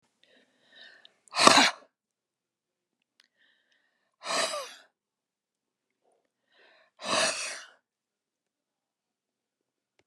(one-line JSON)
{"exhalation_length": "10.1 s", "exhalation_amplitude": 31598, "exhalation_signal_mean_std_ratio": 0.23, "survey_phase": "beta (2021-08-13 to 2022-03-07)", "age": "65+", "gender": "Female", "wearing_mask": "No", "symptom_none": true, "smoker_status": "Ex-smoker", "respiratory_condition_asthma": false, "respiratory_condition_other": true, "recruitment_source": "REACT", "submission_delay": "3 days", "covid_test_result": "Negative", "covid_test_method": "RT-qPCR"}